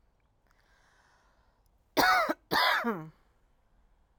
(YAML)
cough_length: 4.2 s
cough_amplitude: 12064
cough_signal_mean_std_ratio: 0.37
survey_phase: alpha (2021-03-01 to 2021-08-12)
age: 45-64
gender: Female
wearing_mask: 'No'
symptom_none: true
smoker_status: Ex-smoker
respiratory_condition_asthma: false
respiratory_condition_other: false
recruitment_source: REACT
submission_delay: 6 days
covid_test_result: Negative
covid_test_method: RT-qPCR